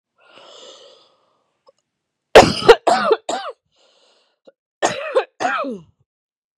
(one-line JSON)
{"cough_length": "6.6 s", "cough_amplitude": 32768, "cough_signal_mean_std_ratio": 0.29, "survey_phase": "beta (2021-08-13 to 2022-03-07)", "age": "45-64", "gender": "Female", "wearing_mask": "No", "symptom_cough_any": true, "symptom_runny_or_blocked_nose": true, "symptom_change_to_sense_of_smell_or_taste": true, "symptom_loss_of_taste": true, "symptom_onset": "6 days", "smoker_status": "Never smoked", "respiratory_condition_asthma": false, "respiratory_condition_other": false, "recruitment_source": "REACT", "submission_delay": "3 days", "covid_test_result": "Negative", "covid_test_method": "RT-qPCR", "influenza_a_test_result": "Negative", "influenza_b_test_result": "Negative"}